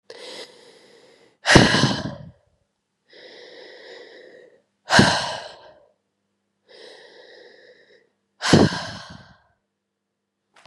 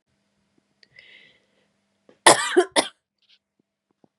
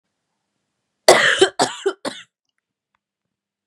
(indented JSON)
{
  "exhalation_length": "10.7 s",
  "exhalation_amplitude": 32768,
  "exhalation_signal_mean_std_ratio": 0.29,
  "cough_length": "4.2 s",
  "cough_amplitude": 32768,
  "cough_signal_mean_std_ratio": 0.21,
  "three_cough_length": "3.7 s",
  "three_cough_amplitude": 32768,
  "three_cough_signal_mean_std_ratio": 0.3,
  "survey_phase": "beta (2021-08-13 to 2022-03-07)",
  "age": "18-44",
  "gender": "Male",
  "wearing_mask": "No",
  "symptom_cough_any": true,
  "symptom_runny_or_blocked_nose": true,
  "symptom_sore_throat": true,
  "symptom_fatigue": true,
  "symptom_fever_high_temperature": true,
  "symptom_headache": true,
  "symptom_onset": "7 days",
  "smoker_status": "Never smoked",
  "respiratory_condition_asthma": false,
  "respiratory_condition_other": false,
  "recruitment_source": "Test and Trace",
  "submission_delay": "1 day",
  "covid_test_result": "Positive",
  "covid_test_method": "RT-qPCR",
  "covid_ct_value": 22.7,
  "covid_ct_gene": "ORF1ab gene"
}